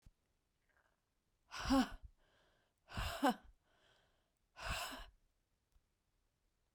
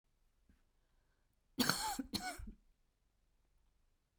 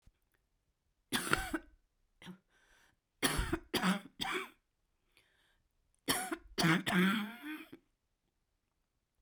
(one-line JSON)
{"exhalation_length": "6.7 s", "exhalation_amplitude": 2671, "exhalation_signal_mean_std_ratio": 0.29, "cough_length": "4.2 s", "cough_amplitude": 5710, "cough_signal_mean_std_ratio": 0.32, "three_cough_length": "9.2 s", "three_cough_amplitude": 7962, "three_cough_signal_mean_std_ratio": 0.4, "survey_phase": "beta (2021-08-13 to 2022-03-07)", "age": "65+", "gender": "Female", "wearing_mask": "No", "symptom_cough_any": true, "symptom_runny_or_blocked_nose": true, "symptom_shortness_of_breath": true, "symptom_sore_throat": true, "symptom_fatigue": true, "symptom_headache": true, "symptom_onset": "4 days", "smoker_status": "Never smoked", "respiratory_condition_asthma": false, "respiratory_condition_other": false, "recruitment_source": "Test and Trace", "submission_delay": "2 days", "covid_test_result": "Positive", "covid_test_method": "RT-qPCR"}